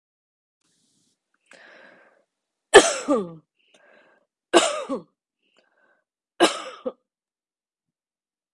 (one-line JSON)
{"three_cough_length": "8.5 s", "three_cough_amplitude": 32768, "three_cough_signal_mean_std_ratio": 0.22, "survey_phase": "beta (2021-08-13 to 2022-03-07)", "age": "45-64", "gender": "Female", "wearing_mask": "No", "symptom_none": true, "smoker_status": "Never smoked", "respiratory_condition_asthma": false, "respiratory_condition_other": false, "recruitment_source": "REACT", "submission_delay": "2 days", "covid_test_result": "Negative", "covid_test_method": "RT-qPCR"}